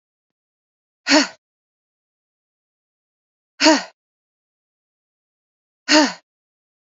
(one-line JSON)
{"exhalation_length": "6.8 s", "exhalation_amplitude": 29976, "exhalation_signal_mean_std_ratio": 0.23, "survey_phase": "beta (2021-08-13 to 2022-03-07)", "age": "18-44", "gender": "Female", "wearing_mask": "No", "symptom_none": true, "smoker_status": "Never smoked", "respiratory_condition_asthma": false, "respiratory_condition_other": false, "recruitment_source": "REACT", "submission_delay": "1 day", "covid_test_result": "Negative", "covid_test_method": "RT-qPCR"}